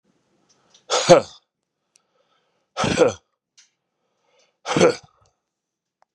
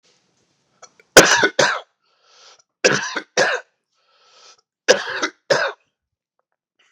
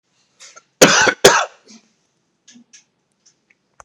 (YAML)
exhalation_length: 6.1 s
exhalation_amplitude: 32768
exhalation_signal_mean_std_ratio: 0.27
three_cough_length: 6.9 s
three_cough_amplitude: 32768
three_cough_signal_mean_std_ratio: 0.32
cough_length: 3.8 s
cough_amplitude: 32768
cough_signal_mean_std_ratio: 0.28
survey_phase: beta (2021-08-13 to 2022-03-07)
age: 45-64
gender: Male
wearing_mask: 'No'
symptom_cough_any: true
symptom_runny_or_blocked_nose: true
symptom_shortness_of_breath: true
symptom_sore_throat: true
symptom_headache: true
smoker_status: Never smoked
respiratory_condition_asthma: false
respiratory_condition_other: false
recruitment_source: Test and Trace
submission_delay: 2 days
covid_test_result: Positive
covid_test_method: RT-qPCR